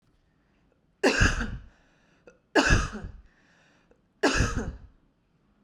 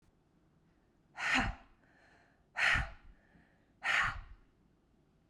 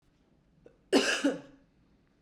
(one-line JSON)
{"three_cough_length": "5.6 s", "three_cough_amplitude": 15983, "three_cough_signal_mean_std_ratio": 0.39, "exhalation_length": "5.3 s", "exhalation_amplitude": 4509, "exhalation_signal_mean_std_ratio": 0.38, "cough_length": "2.2 s", "cough_amplitude": 9856, "cough_signal_mean_std_ratio": 0.35, "survey_phase": "beta (2021-08-13 to 2022-03-07)", "age": "18-44", "gender": "Female", "wearing_mask": "No", "symptom_runny_or_blocked_nose": true, "symptom_headache": true, "smoker_status": "Ex-smoker", "respiratory_condition_asthma": false, "respiratory_condition_other": false, "recruitment_source": "REACT", "submission_delay": "1 day", "covid_test_result": "Negative", "covid_test_method": "RT-qPCR"}